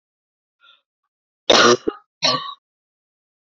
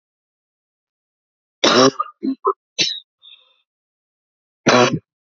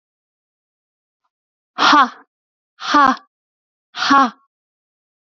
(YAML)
cough_length: 3.6 s
cough_amplitude: 30182
cough_signal_mean_std_ratio: 0.29
three_cough_length: 5.2 s
three_cough_amplitude: 30093
three_cough_signal_mean_std_ratio: 0.33
exhalation_length: 5.2 s
exhalation_amplitude: 31863
exhalation_signal_mean_std_ratio: 0.32
survey_phase: beta (2021-08-13 to 2022-03-07)
age: 18-44
gender: Female
wearing_mask: 'No'
symptom_cough_any: true
symptom_new_continuous_cough: true
symptom_shortness_of_breath: true
symptom_fatigue: true
symptom_fever_high_temperature: true
symptom_headache: true
symptom_onset: 1 day
smoker_status: Never smoked
respiratory_condition_asthma: true
respiratory_condition_other: false
recruitment_source: Test and Trace
submission_delay: 1 day
covid_test_result: Negative
covid_test_method: RT-qPCR